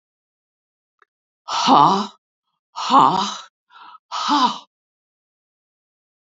{
  "exhalation_length": "6.4 s",
  "exhalation_amplitude": 28813,
  "exhalation_signal_mean_std_ratio": 0.35,
  "survey_phase": "beta (2021-08-13 to 2022-03-07)",
  "age": "65+",
  "gender": "Female",
  "wearing_mask": "No",
  "symptom_cough_any": true,
  "symptom_runny_or_blocked_nose": true,
  "symptom_headache": true,
  "symptom_onset": "3 days",
  "smoker_status": "Ex-smoker",
  "respiratory_condition_asthma": false,
  "respiratory_condition_other": false,
  "recruitment_source": "Test and Trace",
  "submission_delay": "2 days",
  "covid_test_result": "Positive",
  "covid_test_method": "RT-qPCR",
  "covid_ct_value": 24.6,
  "covid_ct_gene": "N gene"
}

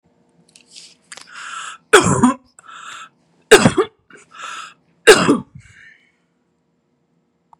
{
  "three_cough_length": "7.6 s",
  "three_cough_amplitude": 32768,
  "three_cough_signal_mean_std_ratio": 0.29,
  "survey_phase": "beta (2021-08-13 to 2022-03-07)",
  "age": "45-64",
  "gender": "Female",
  "wearing_mask": "No",
  "symptom_cough_any": true,
  "symptom_runny_or_blocked_nose": true,
  "symptom_sore_throat": true,
  "symptom_headache": true,
  "symptom_onset": "7 days",
  "smoker_status": "Ex-smoker",
  "respiratory_condition_asthma": true,
  "respiratory_condition_other": false,
  "recruitment_source": "Test and Trace",
  "submission_delay": "2 days",
  "covid_test_result": "Positive",
  "covid_test_method": "RT-qPCR",
  "covid_ct_value": 30.5,
  "covid_ct_gene": "ORF1ab gene"
}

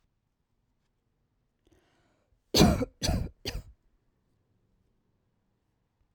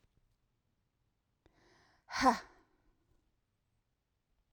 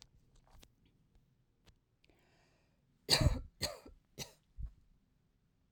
{
  "cough_length": "6.1 s",
  "cough_amplitude": 14382,
  "cough_signal_mean_std_ratio": 0.23,
  "exhalation_length": "4.5 s",
  "exhalation_amplitude": 6529,
  "exhalation_signal_mean_std_ratio": 0.17,
  "three_cough_length": "5.7 s",
  "three_cough_amplitude": 6697,
  "three_cough_signal_mean_std_ratio": 0.24,
  "survey_phase": "beta (2021-08-13 to 2022-03-07)",
  "age": "18-44",
  "gender": "Female",
  "wearing_mask": "No",
  "symptom_sore_throat": true,
  "symptom_onset": "6 days",
  "smoker_status": "Never smoked",
  "respiratory_condition_asthma": false,
  "respiratory_condition_other": false,
  "recruitment_source": "REACT",
  "submission_delay": "2 days",
  "covid_test_result": "Negative",
  "covid_test_method": "RT-qPCR"
}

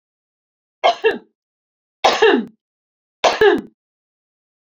{
  "three_cough_length": "4.7 s",
  "three_cough_amplitude": 28837,
  "three_cough_signal_mean_std_ratio": 0.35,
  "survey_phase": "beta (2021-08-13 to 2022-03-07)",
  "age": "45-64",
  "gender": "Female",
  "wearing_mask": "No",
  "symptom_shortness_of_breath": true,
  "symptom_fatigue": true,
  "smoker_status": "Never smoked",
  "respiratory_condition_asthma": false,
  "respiratory_condition_other": false,
  "recruitment_source": "REACT",
  "submission_delay": "2 days",
  "covid_test_result": "Negative",
  "covid_test_method": "RT-qPCR"
}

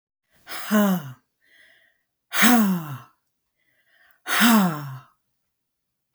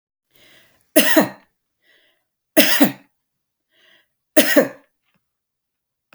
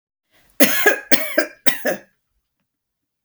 {
  "exhalation_length": "6.1 s",
  "exhalation_amplitude": 27444,
  "exhalation_signal_mean_std_ratio": 0.42,
  "three_cough_length": "6.1 s",
  "three_cough_amplitude": 32768,
  "three_cough_signal_mean_std_ratio": 0.3,
  "cough_length": "3.2 s",
  "cough_amplitude": 32768,
  "cough_signal_mean_std_ratio": 0.37,
  "survey_phase": "beta (2021-08-13 to 2022-03-07)",
  "age": "65+",
  "gender": "Female",
  "wearing_mask": "No",
  "symptom_none": true,
  "smoker_status": "Ex-smoker",
  "respiratory_condition_asthma": false,
  "respiratory_condition_other": false,
  "recruitment_source": "REACT",
  "submission_delay": "1 day",
  "covid_test_result": "Negative",
  "covid_test_method": "RT-qPCR"
}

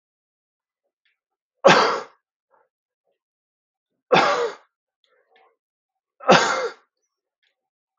{
  "three_cough_length": "8.0 s",
  "three_cough_amplitude": 32485,
  "three_cough_signal_mean_std_ratio": 0.27,
  "survey_phase": "beta (2021-08-13 to 2022-03-07)",
  "age": "18-44",
  "gender": "Male",
  "wearing_mask": "No",
  "symptom_none": true,
  "smoker_status": "Ex-smoker",
  "respiratory_condition_asthma": false,
  "respiratory_condition_other": false,
  "recruitment_source": "REACT",
  "submission_delay": "3 days",
  "covid_test_result": "Negative",
  "covid_test_method": "RT-qPCR",
  "influenza_a_test_result": "Negative",
  "influenza_b_test_result": "Negative"
}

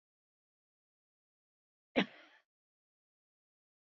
{
  "cough_length": "3.8 s",
  "cough_amplitude": 4657,
  "cough_signal_mean_std_ratio": 0.12,
  "survey_phase": "beta (2021-08-13 to 2022-03-07)",
  "age": "45-64",
  "gender": "Female",
  "wearing_mask": "No",
  "symptom_none": true,
  "smoker_status": "Ex-smoker",
  "respiratory_condition_asthma": false,
  "respiratory_condition_other": false,
  "recruitment_source": "REACT",
  "submission_delay": "2 days",
  "covid_test_result": "Negative",
  "covid_test_method": "RT-qPCR",
  "influenza_a_test_result": "Unknown/Void",
  "influenza_b_test_result": "Unknown/Void"
}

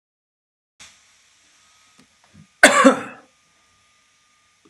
{
  "cough_length": "4.7 s",
  "cough_amplitude": 32768,
  "cough_signal_mean_std_ratio": 0.21,
  "survey_phase": "beta (2021-08-13 to 2022-03-07)",
  "age": "18-44",
  "gender": "Male",
  "wearing_mask": "No",
  "symptom_none": true,
  "smoker_status": "Current smoker (1 to 10 cigarettes per day)",
  "respiratory_condition_asthma": false,
  "respiratory_condition_other": false,
  "recruitment_source": "REACT",
  "submission_delay": "1 day",
  "covid_test_result": "Negative",
  "covid_test_method": "RT-qPCR"
}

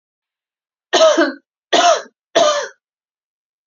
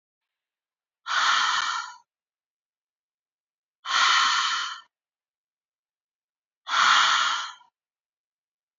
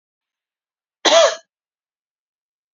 {
  "three_cough_length": "3.7 s",
  "three_cough_amplitude": 32679,
  "three_cough_signal_mean_std_ratio": 0.42,
  "exhalation_length": "8.8 s",
  "exhalation_amplitude": 14130,
  "exhalation_signal_mean_std_ratio": 0.43,
  "cough_length": "2.7 s",
  "cough_amplitude": 32767,
  "cough_signal_mean_std_ratio": 0.26,
  "survey_phase": "beta (2021-08-13 to 2022-03-07)",
  "age": "18-44",
  "gender": "Female",
  "wearing_mask": "No",
  "symptom_none": true,
  "smoker_status": "Never smoked",
  "respiratory_condition_asthma": false,
  "respiratory_condition_other": false,
  "recruitment_source": "REACT",
  "submission_delay": "0 days",
  "covid_test_result": "Negative",
  "covid_test_method": "RT-qPCR"
}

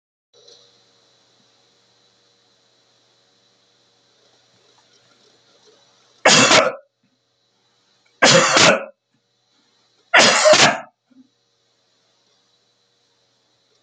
{
  "three_cough_length": "13.8 s",
  "three_cough_amplitude": 32767,
  "three_cough_signal_mean_std_ratio": 0.28,
  "survey_phase": "beta (2021-08-13 to 2022-03-07)",
  "age": "65+",
  "gender": "Male",
  "wearing_mask": "No",
  "symptom_none": true,
  "smoker_status": "Ex-smoker",
  "respiratory_condition_asthma": false,
  "respiratory_condition_other": false,
  "recruitment_source": "REACT",
  "submission_delay": "2 days",
  "covid_test_result": "Negative",
  "covid_test_method": "RT-qPCR",
  "influenza_a_test_result": "Negative",
  "influenza_b_test_result": "Negative"
}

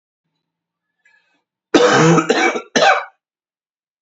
{
  "cough_length": "4.0 s",
  "cough_amplitude": 30715,
  "cough_signal_mean_std_ratio": 0.42,
  "survey_phase": "beta (2021-08-13 to 2022-03-07)",
  "age": "18-44",
  "gender": "Male",
  "wearing_mask": "No",
  "symptom_cough_any": true,
  "symptom_runny_or_blocked_nose": true,
  "symptom_sore_throat": true,
  "symptom_fatigue": true,
  "symptom_onset": "2 days",
  "smoker_status": "Never smoked",
  "respiratory_condition_asthma": false,
  "respiratory_condition_other": false,
  "recruitment_source": "Test and Trace",
  "submission_delay": "1 day",
  "covid_test_result": "Positive",
  "covid_test_method": "RT-qPCR",
  "covid_ct_value": 27.4,
  "covid_ct_gene": "ORF1ab gene"
}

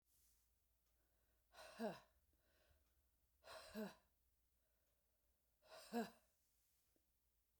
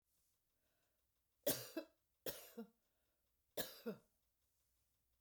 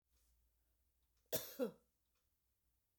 {
  "exhalation_length": "7.6 s",
  "exhalation_amplitude": 620,
  "exhalation_signal_mean_std_ratio": 0.3,
  "three_cough_length": "5.2 s",
  "three_cough_amplitude": 1802,
  "three_cough_signal_mean_std_ratio": 0.28,
  "cough_length": "3.0 s",
  "cough_amplitude": 1572,
  "cough_signal_mean_std_ratio": 0.25,
  "survey_phase": "beta (2021-08-13 to 2022-03-07)",
  "age": "65+",
  "gender": "Female",
  "wearing_mask": "No",
  "symptom_none": true,
  "smoker_status": "Ex-smoker",
  "respiratory_condition_asthma": false,
  "respiratory_condition_other": false,
  "recruitment_source": "REACT",
  "submission_delay": "2 days",
  "covid_test_result": "Negative",
  "covid_test_method": "RT-qPCR",
  "influenza_a_test_result": "Negative",
  "influenza_b_test_result": "Negative"
}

